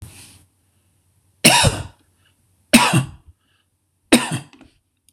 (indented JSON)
{
  "three_cough_length": "5.1 s",
  "three_cough_amplitude": 26028,
  "three_cough_signal_mean_std_ratio": 0.32,
  "survey_phase": "beta (2021-08-13 to 2022-03-07)",
  "age": "45-64",
  "gender": "Male",
  "wearing_mask": "No",
  "symptom_none": true,
  "smoker_status": "Never smoked",
  "respiratory_condition_asthma": false,
  "respiratory_condition_other": false,
  "recruitment_source": "REACT",
  "submission_delay": "3 days",
  "covid_test_result": "Negative",
  "covid_test_method": "RT-qPCR",
  "influenza_a_test_result": "Negative",
  "influenza_b_test_result": "Negative"
}